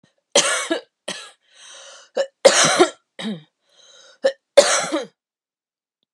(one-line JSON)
{"three_cough_length": "6.1 s", "three_cough_amplitude": 32768, "three_cough_signal_mean_std_ratio": 0.37, "survey_phase": "beta (2021-08-13 to 2022-03-07)", "age": "45-64", "gender": "Female", "wearing_mask": "No", "symptom_cough_any": true, "symptom_runny_or_blocked_nose": true, "symptom_shortness_of_breath": true, "symptom_fatigue": true, "symptom_headache": true, "symptom_change_to_sense_of_smell_or_taste": true, "symptom_other": true, "symptom_onset": "7 days", "smoker_status": "Ex-smoker", "respiratory_condition_asthma": false, "respiratory_condition_other": false, "recruitment_source": "Test and Trace", "submission_delay": "1 day", "covid_test_result": "Positive", "covid_test_method": "RT-qPCR", "covid_ct_value": 24.9, "covid_ct_gene": "ORF1ab gene"}